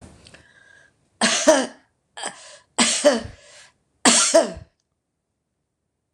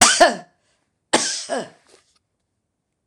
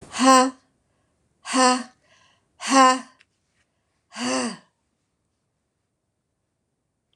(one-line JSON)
{"three_cough_length": "6.1 s", "three_cough_amplitude": 26027, "three_cough_signal_mean_std_ratio": 0.37, "cough_length": "3.1 s", "cough_amplitude": 26028, "cough_signal_mean_std_ratio": 0.34, "exhalation_length": "7.2 s", "exhalation_amplitude": 26027, "exhalation_signal_mean_std_ratio": 0.31, "survey_phase": "beta (2021-08-13 to 2022-03-07)", "age": "65+", "gender": "Female", "wearing_mask": "No", "symptom_none": true, "smoker_status": "Ex-smoker", "respiratory_condition_asthma": false, "respiratory_condition_other": false, "recruitment_source": "REACT", "submission_delay": "0 days", "covid_test_result": "Negative", "covid_test_method": "RT-qPCR", "influenza_a_test_result": "Negative", "influenza_b_test_result": "Negative"}